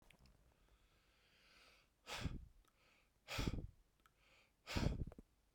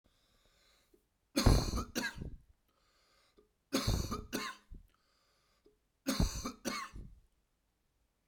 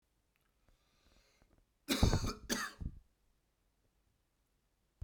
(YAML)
exhalation_length: 5.5 s
exhalation_amplitude: 1743
exhalation_signal_mean_std_ratio: 0.37
three_cough_length: 8.3 s
three_cough_amplitude: 7623
three_cough_signal_mean_std_ratio: 0.35
cough_length: 5.0 s
cough_amplitude: 6450
cough_signal_mean_std_ratio: 0.29
survey_phase: beta (2021-08-13 to 2022-03-07)
age: 18-44
gender: Male
wearing_mask: 'No'
symptom_cough_any: true
symptom_runny_or_blocked_nose: true
symptom_sore_throat: true
symptom_fatigue: true
symptom_onset: 3 days
smoker_status: Never smoked
respiratory_condition_asthma: false
respiratory_condition_other: false
recruitment_source: Test and Trace
submission_delay: 2 days
covid_test_result: Positive
covid_test_method: RT-qPCR
covid_ct_value: 21.5
covid_ct_gene: N gene